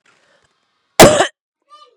{
  "cough_length": "2.0 s",
  "cough_amplitude": 32768,
  "cough_signal_mean_std_ratio": 0.29,
  "survey_phase": "beta (2021-08-13 to 2022-03-07)",
  "age": "18-44",
  "gender": "Female",
  "wearing_mask": "No",
  "symptom_cough_any": true,
  "symptom_runny_or_blocked_nose": true,
  "symptom_sore_throat": true,
  "symptom_fatigue": true,
  "symptom_loss_of_taste": true,
  "symptom_onset": "4 days",
  "smoker_status": "Never smoked",
  "respiratory_condition_asthma": false,
  "respiratory_condition_other": false,
  "recruitment_source": "Test and Trace",
  "submission_delay": "1 day",
  "covid_test_result": "Positive",
  "covid_test_method": "RT-qPCR",
  "covid_ct_value": 15.8,
  "covid_ct_gene": "ORF1ab gene",
  "covid_ct_mean": 16.0,
  "covid_viral_load": "5800000 copies/ml",
  "covid_viral_load_category": "High viral load (>1M copies/ml)"
}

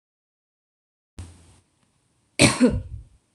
{
  "cough_length": "3.3 s",
  "cough_amplitude": 26027,
  "cough_signal_mean_std_ratio": 0.27,
  "survey_phase": "beta (2021-08-13 to 2022-03-07)",
  "age": "18-44",
  "gender": "Female",
  "wearing_mask": "No",
  "symptom_none": true,
  "smoker_status": "Never smoked",
  "respiratory_condition_asthma": false,
  "respiratory_condition_other": false,
  "recruitment_source": "REACT",
  "submission_delay": "0 days",
  "covid_test_result": "Negative",
  "covid_test_method": "RT-qPCR"
}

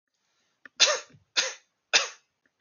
{
  "three_cough_length": "2.6 s",
  "three_cough_amplitude": 21140,
  "three_cough_signal_mean_std_ratio": 0.3,
  "survey_phase": "alpha (2021-03-01 to 2021-08-12)",
  "age": "18-44",
  "gender": "Male",
  "wearing_mask": "No",
  "symptom_none": true,
  "smoker_status": "Never smoked",
  "respiratory_condition_asthma": false,
  "respiratory_condition_other": false,
  "recruitment_source": "REACT",
  "submission_delay": "1 day",
  "covid_test_result": "Negative",
  "covid_test_method": "RT-qPCR"
}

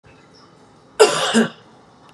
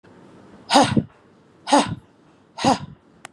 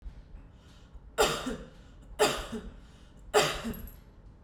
{
  "cough_length": "2.1 s",
  "cough_amplitude": 32647,
  "cough_signal_mean_std_ratio": 0.36,
  "exhalation_length": "3.3 s",
  "exhalation_amplitude": 32672,
  "exhalation_signal_mean_std_ratio": 0.36,
  "three_cough_length": "4.4 s",
  "three_cough_amplitude": 9591,
  "three_cough_signal_mean_std_ratio": 0.46,
  "survey_phase": "beta (2021-08-13 to 2022-03-07)",
  "age": "45-64",
  "gender": "Female",
  "wearing_mask": "No",
  "symptom_none": true,
  "smoker_status": "Never smoked",
  "respiratory_condition_asthma": false,
  "respiratory_condition_other": false,
  "recruitment_source": "REACT",
  "submission_delay": "1 day",
  "covid_test_result": "Negative",
  "covid_test_method": "RT-qPCR",
  "influenza_a_test_result": "Negative",
  "influenza_b_test_result": "Negative"
}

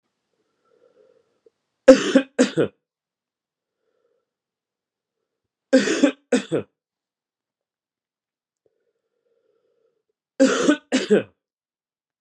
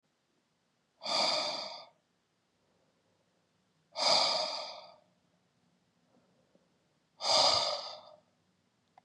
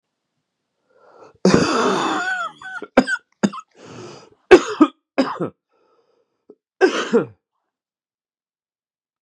{
  "three_cough_length": "12.2 s",
  "three_cough_amplitude": 32768,
  "three_cough_signal_mean_std_ratio": 0.25,
  "exhalation_length": "9.0 s",
  "exhalation_amplitude": 7457,
  "exhalation_signal_mean_std_ratio": 0.38,
  "cough_length": "9.2 s",
  "cough_amplitude": 32768,
  "cough_signal_mean_std_ratio": 0.34,
  "survey_phase": "beta (2021-08-13 to 2022-03-07)",
  "age": "18-44",
  "gender": "Male",
  "wearing_mask": "No",
  "symptom_cough_any": true,
  "symptom_runny_or_blocked_nose": true,
  "symptom_diarrhoea": true,
  "symptom_fatigue": true,
  "symptom_headache": true,
  "symptom_change_to_sense_of_smell_or_taste": true,
  "symptom_loss_of_taste": true,
  "symptom_onset": "4 days",
  "smoker_status": "Never smoked",
  "respiratory_condition_asthma": true,
  "respiratory_condition_other": false,
  "recruitment_source": "Test and Trace",
  "submission_delay": "2 days",
  "covid_test_result": "Positive",
  "covid_test_method": "RT-qPCR"
}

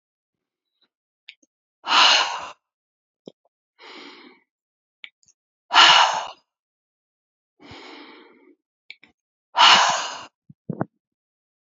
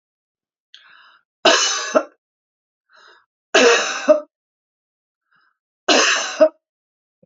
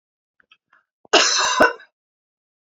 {
  "exhalation_length": "11.6 s",
  "exhalation_amplitude": 32768,
  "exhalation_signal_mean_std_ratio": 0.28,
  "three_cough_length": "7.3 s",
  "three_cough_amplitude": 29546,
  "three_cough_signal_mean_std_ratio": 0.36,
  "cough_length": "2.6 s",
  "cough_amplitude": 31239,
  "cough_signal_mean_std_ratio": 0.36,
  "survey_phase": "beta (2021-08-13 to 2022-03-07)",
  "age": "45-64",
  "gender": "Female",
  "wearing_mask": "No",
  "symptom_none": true,
  "smoker_status": "Ex-smoker",
  "respiratory_condition_asthma": true,
  "respiratory_condition_other": false,
  "recruitment_source": "REACT",
  "submission_delay": "2 days",
  "covid_test_result": "Negative",
  "covid_test_method": "RT-qPCR",
  "influenza_a_test_result": "Negative",
  "influenza_b_test_result": "Negative"
}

